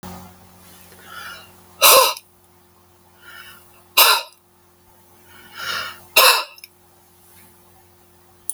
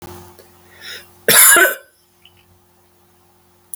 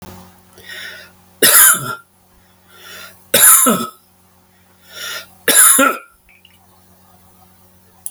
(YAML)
exhalation_length: 8.5 s
exhalation_amplitude: 32768
exhalation_signal_mean_std_ratio: 0.3
cough_length: 3.8 s
cough_amplitude: 32768
cough_signal_mean_std_ratio: 0.32
three_cough_length: 8.1 s
three_cough_amplitude: 32768
three_cough_signal_mean_std_ratio: 0.37
survey_phase: alpha (2021-03-01 to 2021-08-12)
age: 65+
gender: Male
wearing_mask: 'No'
symptom_none: true
smoker_status: Never smoked
respiratory_condition_asthma: false
respiratory_condition_other: false
recruitment_source: REACT
submission_delay: 1 day
covid_test_result: Negative
covid_test_method: RT-qPCR